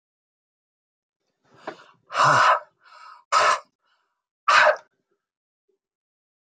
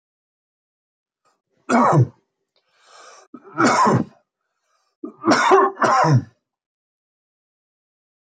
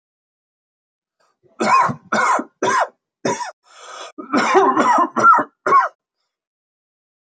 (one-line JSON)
{"exhalation_length": "6.6 s", "exhalation_amplitude": 20091, "exhalation_signal_mean_std_ratio": 0.33, "three_cough_length": "8.4 s", "three_cough_amplitude": 30649, "three_cough_signal_mean_std_ratio": 0.39, "cough_length": "7.3 s", "cough_amplitude": 26582, "cough_signal_mean_std_ratio": 0.48, "survey_phase": "alpha (2021-03-01 to 2021-08-12)", "age": "65+", "gender": "Male", "wearing_mask": "No", "symptom_none": true, "smoker_status": "Ex-smoker", "respiratory_condition_asthma": false, "respiratory_condition_other": false, "recruitment_source": "REACT", "submission_delay": "3 days", "covid_test_result": "Negative", "covid_test_method": "RT-qPCR"}